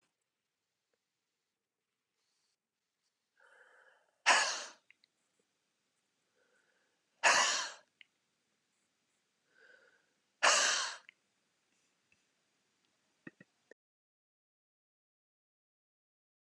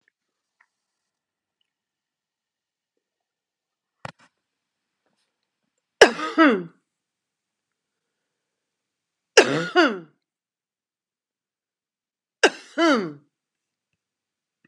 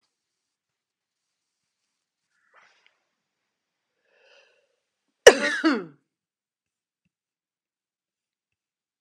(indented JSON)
{
  "exhalation_length": "16.5 s",
  "exhalation_amplitude": 7148,
  "exhalation_signal_mean_std_ratio": 0.21,
  "three_cough_length": "14.7 s",
  "three_cough_amplitude": 32768,
  "three_cough_signal_mean_std_ratio": 0.2,
  "cough_length": "9.0 s",
  "cough_amplitude": 32768,
  "cough_signal_mean_std_ratio": 0.13,
  "survey_phase": "beta (2021-08-13 to 2022-03-07)",
  "age": "65+",
  "gender": "Female",
  "wearing_mask": "No",
  "symptom_none": true,
  "smoker_status": "Ex-smoker",
  "respiratory_condition_asthma": false,
  "respiratory_condition_other": false,
  "recruitment_source": "REACT",
  "submission_delay": "1 day",
  "covid_test_result": "Negative",
  "covid_test_method": "RT-qPCR"
}